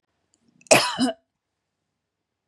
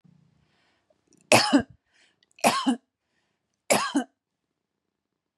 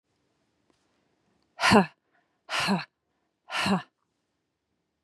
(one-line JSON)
{"cough_length": "2.5 s", "cough_amplitude": 32768, "cough_signal_mean_std_ratio": 0.27, "three_cough_length": "5.4 s", "three_cough_amplitude": 29225, "three_cough_signal_mean_std_ratio": 0.3, "exhalation_length": "5.0 s", "exhalation_amplitude": 20617, "exhalation_signal_mean_std_ratio": 0.3, "survey_phase": "beta (2021-08-13 to 2022-03-07)", "age": "45-64", "gender": "Female", "wearing_mask": "No", "symptom_none": true, "smoker_status": "Never smoked", "respiratory_condition_asthma": false, "respiratory_condition_other": false, "recruitment_source": "REACT", "submission_delay": "3 days", "covid_test_result": "Negative", "covid_test_method": "RT-qPCR", "influenza_a_test_result": "Negative", "influenza_b_test_result": "Negative"}